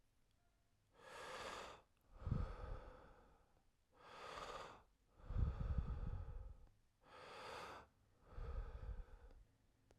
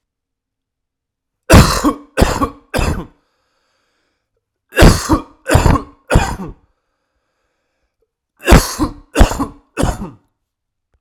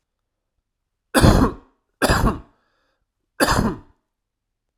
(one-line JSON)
{"exhalation_length": "10.0 s", "exhalation_amplitude": 1418, "exhalation_signal_mean_std_ratio": 0.55, "cough_length": "11.0 s", "cough_amplitude": 32768, "cough_signal_mean_std_ratio": 0.36, "three_cough_length": "4.8 s", "three_cough_amplitude": 32768, "three_cough_signal_mean_std_ratio": 0.36, "survey_phase": "beta (2021-08-13 to 2022-03-07)", "age": "18-44", "gender": "Male", "wearing_mask": "No", "symptom_cough_any": true, "symptom_runny_or_blocked_nose": true, "symptom_abdominal_pain": true, "symptom_fever_high_temperature": true, "symptom_headache": true, "symptom_change_to_sense_of_smell_or_taste": true, "symptom_loss_of_taste": true, "symptom_onset": "6 days", "smoker_status": "Never smoked", "respiratory_condition_asthma": false, "respiratory_condition_other": false, "recruitment_source": "Test and Trace", "submission_delay": "2 days", "covid_test_result": "Positive", "covid_test_method": "RT-qPCR", "covid_ct_value": 22.0, "covid_ct_gene": "ORF1ab gene", "covid_ct_mean": 22.6, "covid_viral_load": "39000 copies/ml", "covid_viral_load_category": "Low viral load (10K-1M copies/ml)"}